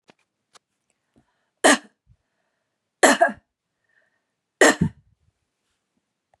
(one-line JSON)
{"three_cough_length": "6.4 s", "three_cough_amplitude": 31381, "three_cough_signal_mean_std_ratio": 0.23, "survey_phase": "beta (2021-08-13 to 2022-03-07)", "age": "45-64", "gender": "Female", "wearing_mask": "No", "symptom_none": true, "smoker_status": "Never smoked", "respiratory_condition_asthma": false, "respiratory_condition_other": false, "recruitment_source": "REACT", "submission_delay": "1 day", "covid_test_result": "Negative", "covid_test_method": "RT-qPCR", "influenza_a_test_result": "Unknown/Void", "influenza_b_test_result": "Unknown/Void"}